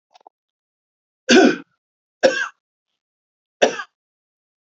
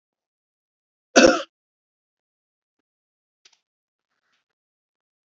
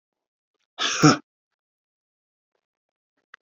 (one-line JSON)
{"three_cough_length": "4.7 s", "three_cough_amplitude": 32768, "three_cough_signal_mean_std_ratio": 0.27, "cough_length": "5.3 s", "cough_amplitude": 29971, "cough_signal_mean_std_ratio": 0.15, "exhalation_length": "3.4 s", "exhalation_amplitude": 26707, "exhalation_signal_mean_std_ratio": 0.21, "survey_phase": "beta (2021-08-13 to 2022-03-07)", "age": "45-64", "gender": "Male", "wearing_mask": "No", "symptom_none": true, "smoker_status": "Ex-smoker", "respiratory_condition_asthma": false, "respiratory_condition_other": false, "recruitment_source": "REACT", "submission_delay": "7 days", "covid_test_result": "Negative", "covid_test_method": "RT-qPCR", "influenza_a_test_result": "Negative", "influenza_b_test_result": "Negative"}